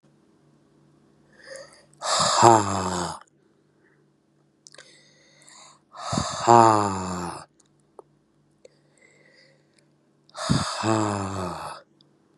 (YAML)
exhalation_length: 12.4 s
exhalation_amplitude: 32767
exhalation_signal_mean_std_ratio: 0.35
survey_phase: beta (2021-08-13 to 2022-03-07)
age: 18-44
gender: Male
wearing_mask: 'No'
symptom_cough_any: true
symptom_new_continuous_cough: true
symptom_runny_or_blocked_nose: true
symptom_shortness_of_breath: true
symptom_fatigue: true
symptom_headache: true
symptom_change_to_sense_of_smell_or_taste: true
symptom_onset: 5 days
smoker_status: Current smoker (11 or more cigarettes per day)
respiratory_condition_asthma: true
respiratory_condition_other: false
recruitment_source: Test and Trace
submission_delay: 1 day
covid_test_result: Negative
covid_test_method: RT-qPCR